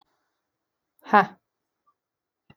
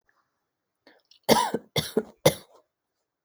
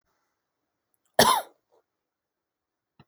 {"exhalation_length": "2.6 s", "exhalation_amplitude": 26425, "exhalation_signal_mean_std_ratio": 0.16, "three_cough_length": "3.2 s", "three_cough_amplitude": 26271, "three_cough_signal_mean_std_ratio": 0.28, "cough_length": "3.1 s", "cough_amplitude": 21942, "cough_signal_mean_std_ratio": 0.2, "survey_phase": "alpha (2021-03-01 to 2021-08-12)", "age": "18-44", "gender": "Female", "wearing_mask": "No", "symptom_none": true, "smoker_status": "Current smoker (1 to 10 cigarettes per day)", "respiratory_condition_asthma": true, "respiratory_condition_other": false, "recruitment_source": "REACT", "submission_delay": "14 days", "covid_test_result": "Negative", "covid_test_method": "RT-qPCR"}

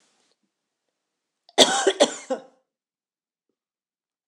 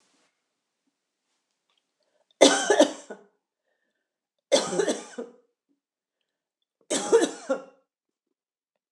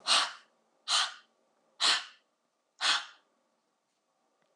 {"cough_length": "4.3 s", "cough_amplitude": 26028, "cough_signal_mean_std_ratio": 0.24, "three_cough_length": "8.9 s", "three_cough_amplitude": 25429, "three_cough_signal_mean_std_ratio": 0.28, "exhalation_length": "4.6 s", "exhalation_amplitude": 8151, "exhalation_signal_mean_std_ratio": 0.35, "survey_phase": "beta (2021-08-13 to 2022-03-07)", "age": "65+", "gender": "Female", "wearing_mask": "No", "symptom_none": true, "smoker_status": "Never smoked", "respiratory_condition_asthma": true, "respiratory_condition_other": false, "recruitment_source": "REACT", "submission_delay": "1 day", "covid_test_result": "Negative", "covid_test_method": "RT-qPCR"}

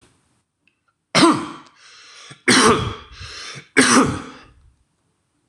{"three_cough_length": "5.5 s", "three_cough_amplitude": 26028, "three_cough_signal_mean_std_ratio": 0.39, "survey_phase": "beta (2021-08-13 to 2022-03-07)", "age": "45-64", "gender": "Male", "wearing_mask": "No", "symptom_fatigue": true, "symptom_onset": "9 days", "smoker_status": "Ex-smoker", "respiratory_condition_asthma": false, "respiratory_condition_other": false, "recruitment_source": "REACT", "submission_delay": "2 days", "covid_test_result": "Negative", "covid_test_method": "RT-qPCR", "influenza_a_test_result": "Unknown/Void", "influenza_b_test_result": "Unknown/Void"}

